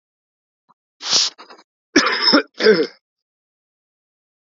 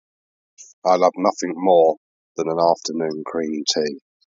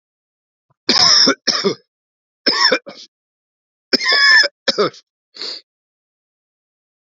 {
  "cough_length": "4.5 s",
  "cough_amplitude": 32768,
  "cough_signal_mean_std_ratio": 0.36,
  "exhalation_length": "4.3 s",
  "exhalation_amplitude": 26806,
  "exhalation_signal_mean_std_ratio": 0.53,
  "three_cough_length": "7.1 s",
  "three_cough_amplitude": 32768,
  "three_cough_signal_mean_std_ratio": 0.41,
  "survey_phase": "beta (2021-08-13 to 2022-03-07)",
  "age": "45-64",
  "gender": "Male",
  "wearing_mask": "No",
  "symptom_cough_any": true,
  "symptom_runny_or_blocked_nose": true,
  "symptom_sore_throat": true,
  "symptom_fever_high_temperature": true,
  "smoker_status": "Ex-smoker",
  "respiratory_condition_asthma": false,
  "respiratory_condition_other": false,
  "recruitment_source": "Test and Trace",
  "submission_delay": "2 days",
  "covid_test_result": "Positive",
  "covid_test_method": "LFT"
}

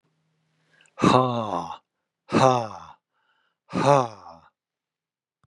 {
  "exhalation_length": "5.5 s",
  "exhalation_amplitude": 24453,
  "exhalation_signal_mean_std_ratio": 0.34,
  "survey_phase": "beta (2021-08-13 to 2022-03-07)",
  "age": "45-64",
  "gender": "Male",
  "wearing_mask": "No",
  "symptom_none": true,
  "smoker_status": "Never smoked",
  "respiratory_condition_asthma": false,
  "respiratory_condition_other": false,
  "recruitment_source": "REACT",
  "submission_delay": "2 days",
  "covid_test_result": "Negative",
  "covid_test_method": "RT-qPCR",
  "influenza_a_test_result": "Negative",
  "influenza_b_test_result": "Negative"
}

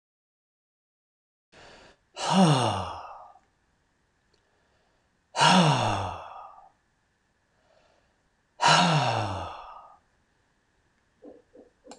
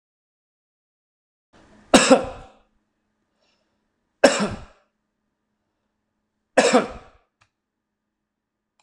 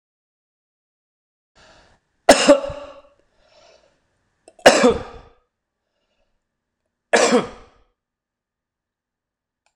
{
  "exhalation_length": "12.0 s",
  "exhalation_amplitude": 18315,
  "exhalation_signal_mean_std_ratio": 0.36,
  "three_cough_length": "8.8 s",
  "three_cough_amplitude": 26028,
  "three_cough_signal_mean_std_ratio": 0.23,
  "cough_length": "9.8 s",
  "cough_amplitude": 26028,
  "cough_signal_mean_std_ratio": 0.24,
  "survey_phase": "alpha (2021-03-01 to 2021-08-12)",
  "age": "65+",
  "gender": "Male",
  "wearing_mask": "No",
  "symptom_none": true,
  "smoker_status": "Never smoked",
  "respiratory_condition_asthma": false,
  "respiratory_condition_other": false,
  "recruitment_source": "REACT",
  "submission_delay": "3 days",
  "covid_test_result": "Negative",
  "covid_test_method": "RT-qPCR"
}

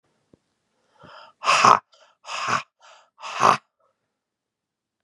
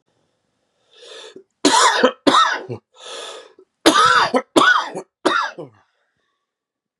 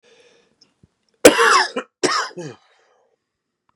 {
  "exhalation_length": "5.0 s",
  "exhalation_amplitude": 32768,
  "exhalation_signal_mean_std_ratio": 0.28,
  "three_cough_length": "7.0 s",
  "three_cough_amplitude": 32768,
  "three_cough_signal_mean_std_ratio": 0.44,
  "cough_length": "3.8 s",
  "cough_amplitude": 32768,
  "cough_signal_mean_std_ratio": 0.31,
  "survey_phase": "beta (2021-08-13 to 2022-03-07)",
  "age": "45-64",
  "gender": "Male",
  "wearing_mask": "No",
  "symptom_cough_any": true,
  "symptom_runny_or_blocked_nose": true,
  "symptom_shortness_of_breath": true,
  "symptom_fatigue": true,
  "symptom_onset": "3 days",
  "smoker_status": "Ex-smoker",
  "respiratory_condition_asthma": false,
  "respiratory_condition_other": false,
  "recruitment_source": "Test and Trace",
  "submission_delay": "1 day",
  "covid_test_result": "Positive",
  "covid_test_method": "RT-qPCR",
  "covid_ct_value": 25.1,
  "covid_ct_gene": "ORF1ab gene"
}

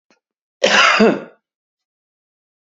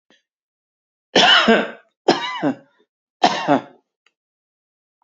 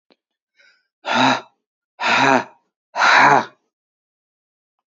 {
  "cough_length": "2.7 s",
  "cough_amplitude": 32768,
  "cough_signal_mean_std_ratio": 0.36,
  "three_cough_length": "5.0 s",
  "three_cough_amplitude": 31770,
  "three_cough_signal_mean_std_ratio": 0.37,
  "exhalation_length": "4.9 s",
  "exhalation_amplitude": 32213,
  "exhalation_signal_mean_std_ratio": 0.4,
  "survey_phase": "beta (2021-08-13 to 2022-03-07)",
  "age": "18-44",
  "gender": "Male",
  "wearing_mask": "No",
  "symptom_none": true,
  "smoker_status": "Current smoker (e-cigarettes or vapes only)",
  "respiratory_condition_asthma": false,
  "respiratory_condition_other": false,
  "recruitment_source": "REACT",
  "submission_delay": "2 days",
  "covid_test_result": "Negative",
  "covid_test_method": "RT-qPCR",
  "influenza_a_test_result": "Negative",
  "influenza_b_test_result": "Negative"
}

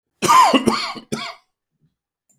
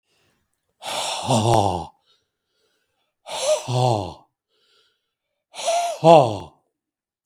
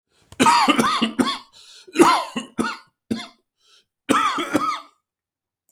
{
  "cough_length": "2.4 s",
  "cough_amplitude": 32766,
  "cough_signal_mean_std_ratio": 0.43,
  "exhalation_length": "7.3 s",
  "exhalation_amplitude": 32253,
  "exhalation_signal_mean_std_ratio": 0.39,
  "three_cough_length": "5.7 s",
  "three_cough_amplitude": 32766,
  "three_cough_signal_mean_std_ratio": 0.48,
  "survey_phase": "beta (2021-08-13 to 2022-03-07)",
  "age": "45-64",
  "gender": "Male",
  "wearing_mask": "No",
  "symptom_runny_or_blocked_nose": true,
  "symptom_fatigue": true,
  "symptom_onset": "13 days",
  "smoker_status": "Ex-smoker",
  "respiratory_condition_asthma": false,
  "respiratory_condition_other": false,
  "recruitment_source": "REACT",
  "submission_delay": "1 day",
  "covid_test_result": "Negative",
  "covid_test_method": "RT-qPCR",
  "influenza_a_test_result": "Negative",
  "influenza_b_test_result": "Negative"
}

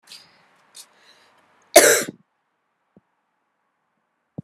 {
  "cough_length": "4.4 s",
  "cough_amplitude": 32768,
  "cough_signal_mean_std_ratio": 0.19,
  "survey_phase": "beta (2021-08-13 to 2022-03-07)",
  "age": "45-64",
  "gender": "Female",
  "wearing_mask": "No",
  "symptom_cough_any": true,
  "symptom_runny_or_blocked_nose": true,
  "symptom_sore_throat": true,
  "symptom_fatigue": true,
  "symptom_fever_high_temperature": true,
  "symptom_headache": true,
  "symptom_onset": "3 days",
  "smoker_status": "Never smoked",
  "respiratory_condition_asthma": false,
  "respiratory_condition_other": false,
  "recruitment_source": "Test and Trace",
  "submission_delay": "2 days",
  "covid_test_result": "Positive",
  "covid_test_method": "RT-qPCR",
  "covid_ct_value": 21.2,
  "covid_ct_gene": "ORF1ab gene",
  "covid_ct_mean": 21.8,
  "covid_viral_load": "69000 copies/ml",
  "covid_viral_load_category": "Low viral load (10K-1M copies/ml)"
}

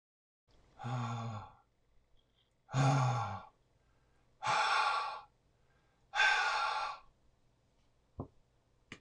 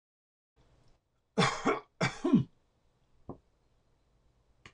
{
  "exhalation_length": "9.0 s",
  "exhalation_amplitude": 4364,
  "exhalation_signal_mean_std_ratio": 0.47,
  "cough_length": "4.7 s",
  "cough_amplitude": 7937,
  "cough_signal_mean_std_ratio": 0.3,
  "survey_phase": "alpha (2021-03-01 to 2021-08-12)",
  "age": "65+",
  "gender": "Male",
  "wearing_mask": "No",
  "symptom_none": true,
  "smoker_status": "Ex-smoker",
  "respiratory_condition_asthma": false,
  "respiratory_condition_other": false,
  "recruitment_source": "REACT",
  "submission_delay": "1 day",
  "covid_test_result": "Negative",
  "covid_test_method": "RT-qPCR"
}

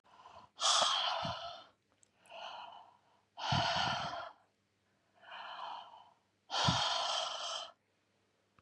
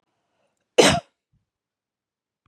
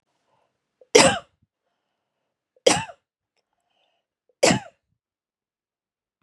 {
  "exhalation_length": "8.6 s",
  "exhalation_amplitude": 5017,
  "exhalation_signal_mean_std_ratio": 0.53,
  "cough_length": "2.5 s",
  "cough_amplitude": 29000,
  "cough_signal_mean_std_ratio": 0.22,
  "three_cough_length": "6.2 s",
  "three_cough_amplitude": 32768,
  "three_cough_signal_mean_std_ratio": 0.21,
  "survey_phase": "beta (2021-08-13 to 2022-03-07)",
  "age": "45-64",
  "gender": "Female",
  "wearing_mask": "No",
  "symptom_none": true,
  "smoker_status": "Never smoked",
  "respiratory_condition_asthma": false,
  "respiratory_condition_other": false,
  "recruitment_source": "REACT",
  "submission_delay": "1 day",
  "covid_test_result": "Negative",
  "covid_test_method": "RT-qPCR",
  "influenza_a_test_result": "Negative",
  "influenza_b_test_result": "Negative"
}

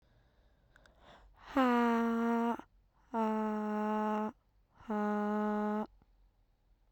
{
  "exhalation_length": "6.9 s",
  "exhalation_amplitude": 3567,
  "exhalation_signal_mean_std_ratio": 0.64,
  "survey_phase": "beta (2021-08-13 to 2022-03-07)",
  "age": "18-44",
  "gender": "Female",
  "wearing_mask": "No",
  "symptom_cough_any": true,
  "symptom_runny_or_blocked_nose": true,
  "symptom_sore_throat": true,
  "symptom_fatigue": true,
  "symptom_headache": true,
  "symptom_other": true,
  "smoker_status": "Never smoked",
  "respiratory_condition_asthma": false,
  "respiratory_condition_other": false,
  "recruitment_source": "Test and Trace",
  "submission_delay": "2 days",
  "covid_test_result": "Positive",
  "covid_test_method": "ePCR"
}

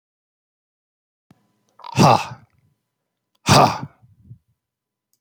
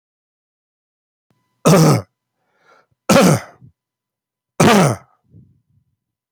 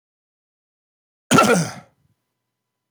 {
  "exhalation_length": "5.2 s",
  "exhalation_amplitude": 27415,
  "exhalation_signal_mean_std_ratio": 0.26,
  "three_cough_length": "6.3 s",
  "three_cough_amplitude": 31628,
  "three_cough_signal_mean_std_ratio": 0.34,
  "cough_length": "2.9 s",
  "cough_amplitude": 26585,
  "cough_signal_mean_std_ratio": 0.29,
  "survey_phase": "beta (2021-08-13 to 2022-03-07)",
  "age": "65+",
  "gender": "Male",
  "wearing_mask": "No",
  "symptom_none": true,
  "smoker_status": "Never smoked",
  "respiratory_condition_asthma": false,
  "respiratory_condition_other": false,
  "recruitment_source": "Test and Trace",
  "submission_delay": "0 days",
  "covid_test_result": "Negative",
  "covid_test_method": "LFT"
}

